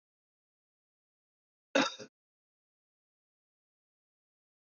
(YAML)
cough_length: 4.6 s
cough_amplitude: 5674
cough_signal_mean_std_ratio: 0.14
survey_phase: beta (2021-08-13 to 2022-03-07)
age: 45-64
gender: Male
wearing_mask: 'No'
symptom_cough_any: true
symptom_runny_or_blocked_nose: true
symptom_fatigue: true
symptom_change_to_sense_of_smell_or_taste: true
smoker_status: Never smoked
respiratory_condition_asthma: false
respiratory_condition_other: false
recruitment_source: Test and Trace
submission_delay: 2 days
covid_test_result: Positive
covid_test_method: RT-qPCR
covid_ct_value: 11.7
covid_ct_gene: ORF1ab gene
covid_ct_mean: 12.0
covid_viral_load: 110000000 copies/ml
covid_viral_load_category: High viral load (>1M copies/ml)